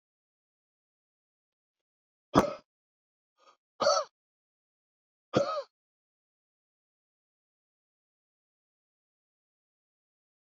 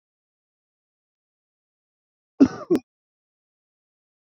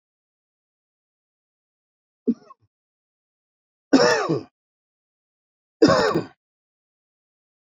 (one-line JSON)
{"exhalation_length": "10.4 s", "exhalation_amplitude": 18156, "exhalation_signal_mean_std_ratio": 0.18, "cough_length": "4.4 s", "cough_amplitude": 23091, "cough_signal_mean_std_ratio": 0.15, "three_cough_length": "7.7 s", "three_cough_amplitude": 26264, "three_cough_signal_mean_std_ratio": 0.26, "survey_phase": "beta (2021-08-13 to 2022-03-07)", "age": "45-64", "gender": "Male", "wearing_mask": "No", "symptom_none": true, "smoker_status": "Ex-smoker", "respiratory_condition_asthma": false, "respiratory_condition_other": false, "recruitment_source": "REACT", "submission_delay": "1 day", "covid_test_result": "Negative", "covid_test_method": "RT-qPCR", "influenza_a_test_result": "Negative", "influenza_b_test_result": "Negative"}